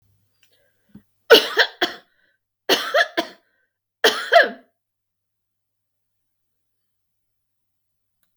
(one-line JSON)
{"three_cough_length": "8.4 s", "three_cough_amplitude": 32768, "three_cough_signal_mean_std_ratio": 0.25, "survey_phase": "beta (2021-08-13 to 2022-03-07)", "age": "65+", "gender": "Female", "wearing_mask": "No", "symptom_cough_any": true, "symptom_headache": true, "symptom_change_to_sense_of_smell_or_taste": true, "smoker_status": "Never smoked", "respiratory_condition_asthma": false, "respiratory_condition_other": false, "recruitment_source": "Test and Trace", "submission_delay": "0 days", "covid_test_result": "Negative", "covid_test_method": "LFT"}